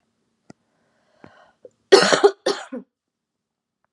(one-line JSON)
{"cough_length": "3.9 s", "cough_amplitude": 32768, "cough_signal_mean_std_ratio": 0.25, "survey_phase": "beta (2021-08-13 to 2022-03-07)", "age": "18-44", "gender": "Female", "wearing_mask": "No", "symptom_cough_any": true, "symptom_runny_or_blocked_nose": true, "symptom_shortness_of_breath": true, "symptom_diarrhoea": true, "symptom_fatigue": true, "symptom_headache": true, "symptom_onset": "5 days", "smoker_status": "Current smoker (1 to 10 cigarettes per day)", "respiratory_condition_asthma": true, "respiratory_condition_other": false, "recruitment_source": "REACT", "submission_delay": "1 day", "covid_test_result": "Positive", "covid_test_method": "RT-qPCR", "covid_ct_value": 20.8, "covid_ct_gene": "E gene", "influenza_a_test_result": "Negative", "influenza_b_test_result": "Negative"}